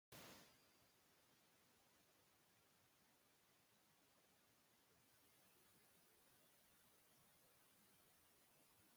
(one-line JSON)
{"exhalation_length": "9.0 s", "exhalation_amplitude": 122, "exhalation_signal_mean_std_ratio": 0.84, "survey_phase": "beta (2021-08-13 to 2022-03-07)", "age": "65+", "gender": "Female", "wearing_mask": "No", "symptom_none": true, "smoker_status": "Ex-smoker", "respiratory_condition_asthma": false, "respiratory_condition_other": false, "recruitment_source": "Test and Trace", "submission_delay": "1 day", "covid_test_result": "Negative", "covid_test_method": "LFT"}